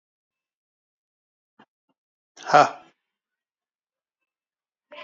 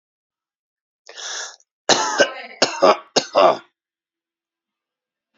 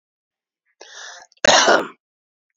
{
  "exhalation_length": "5.0 s",
  "exhalation_amplitude": 25012,
  "exhalation_signal_mean_std_ratio": 0.14,
  "three_cough_length": "5.4 s",
  "three_cough_amplitude": 31417,
  "three_cough_signal_mean_std_ratio": 0.33,
  "cough_length": "2.6 s",
  "cough_amplitude": 31438,
  "cough_signal_mean_std_ratio": 0.32,
  "survey_phase": "beta (2021-08-13 to 2022-03-07)",
  "age": "45-64",
  "gender": "Male",
  "wearing_mask": "No",
  "symptom_change_to_sense_of_smell_or_taste": true,
  "symptom_loss_of_taste": true,
  "symptom_onset": "8 days",
  "smoker_status": "Ex-smoker",
  "respiratory_condition_asthma": false,
  "respiratory_condition_other": false,
  "recruitment_source": "Test and Trace",
  "submission_delay": "2 days",
  "covid_test_result": "Positive",
  "covid_test_method": "RT-qPCR",
  "covid_ct_value": 30.0,
  "covid_ct_gene": "ORF1ab gene"
}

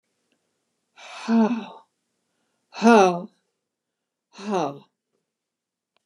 {
  "exhalation_length": "6.1 s",
  "exhalation_amplitude": 25163,
  "exhalation_signal_mean_std_ratio": 0.3,
  "survey_phase": "beta (2021-08-13 to 2022-03-07)",
  "age": "65+",
  "gender": "Female",
  "wearing_mask": "No",
  "symptom_none": true,
  "smoker_status": "Never smoked",
  "respiratory_condition_asthma": false,
  "respiratory_condition_other": false,
  "recruitment_source": "REACT",
  "submission_delay": "1 day",
  "covid_test_result": "Negative",
  "covid_test_method": "RT-qPCR",
  "influenza_a_test_result": "Negative",
  "influenza_b_test_result": "Negative"
}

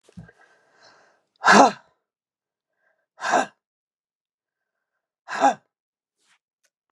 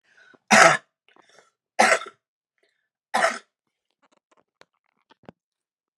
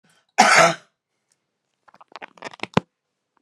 {
  "exhalation_length": "6.9 s",
  "exhalation_amplitude": 32216,
  "exhalation_signal_mean_std_ratio": 0.23,
  "three_cough_length": "6.0 s",
  "three_cough_amplitude": 32767,
  "three_cough_signal_mean_std_ratio": 0.25,
  "cough_length": "3.4 s",
  "cough_amplitude": 32594,
  "cough_signal_mean_std_ratio": 0.27,
  "survey_phase": "beta (2021-08-13 to 2022-03-07)",
  "age": "45-64",
  "gender": "Female",
  "wearing_mask": "No",
  "symptom_none": true,
  "smoker_status": "Prefer not to say",
  "respiratory_condition_asthma": true,
  "respiratory_condition_other": false,
  "recruitment_source": "REACT",
  "submission_delay": "1 day",
  "covid_test_result": "Negative",
  "covid_test_method": "RT-qPCR",
  "influenza_a_test_result": "Negative",
  "influenza_b_test_result": "Negative"
}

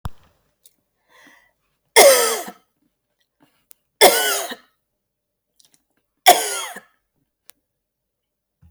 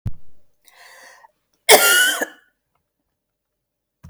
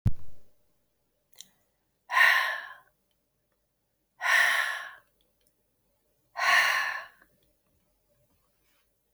{
  "three_cough_length": "8.7 s",
  "three_cough_amplitude": 32768,
  "three_cough_signal_mean_std_ratio": 0.27,
  "cough_length": "4.1 s",
  "cough_amplitude": 32768,
  "cough_signal_mean_std_ratio": 0.32,
  "exhalation_length": "9.1 s",
  "exhalation_amplitude": 12557,
  "exhalation_signal_mean_std_ratio": 0.38,
  "survey_phase": "beta (2021-08-13 to 2022-03-07)",
  "age": "45-64",
  "gender": "Female",
  "wearing_mask": "No",
  "symptom_none": true,
  "smoker_status": "Never smoked",
  "respiratory_condition_asthma": false,
  "respiratory_condition_other": false,
  "recruitment_source": "REACT",
  "submission_delay": "2 days",
  "covid_test_result": "Negative",
  "covid_test_method": "RT-qPCR",
  "influenza_a_test_result": "Negative",
  "influenza_b_test_result": "Negative"
}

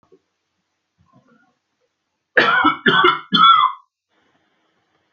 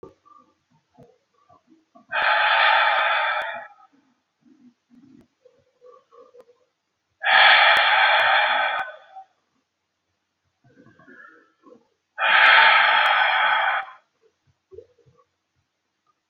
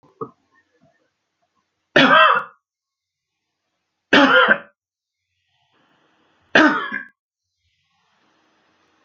{
  "cough_length": "5.1 s",
  "cough_amplitude": 30117,
  "cough_signal_mean_std_ratio": 0.38,
  "exhalation_length": "16.3 s",
  "exhalation_amplitude": 26898,
  "exhalation_signal_mean_std_ratio": 0.45,
  "three_cough_length": "9.0 s",
  "three_cough_amplitude": 32768,
  "three_cough_signal_mean_std_ratio": 0.3,
  "survey_phase": "alpha (2021-03-01 to 2021-08-12)",
  "age": "45-64",
  "gender": "Male",
  "wearing_mask": "No",
  "symptom_none": true,
  "smoker_status": "Never smoked",
  "respiratory_condition_asthma": false,
  "respiratory_condition_other": false,
  "recruitment_source": "REACT",
  "submission_delay": "5 days",
  "covid_test_result": "Negative",
  "covid_test_method": "RT-qPCR"
}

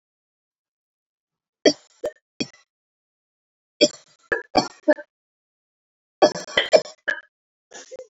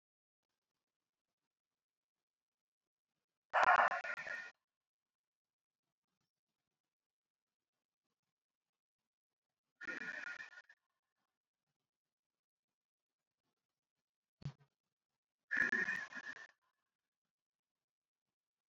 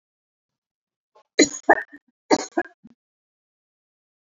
{
  "three_cough_length": "8.1 s",
  "three_cough_amplitude": 28848,
  "three_cough_signal_mean_std_ratio": 0.23,
  "exhalation_length": "18.7 s",
  "exhalation_amplitude": 4348,
  "exhalation_signal_mean_std_ratio": 0.21,
  "cough_length": "4.4 s",
  "cough_amplitude": 27671,
  "cough_signal_mean_std_ratio": 0.2,
  "survey_phase": "beta (2021-08-13 to 2022-03-07)",
  "age": "18-44",
  "gender": "Female",
  "wearing_mask": "No",
  "symptom_none": true,
  "smoker_status": "Never smoked",
  "respiratory_condition_asthma": false,
  "respiratory_condition_other": false,
  "recruitment_source": "REACT",
  "submission_delay": "1 day",
  "covid_test_result": "Negative",
  "covid_test_method": "RT-qPCR"
}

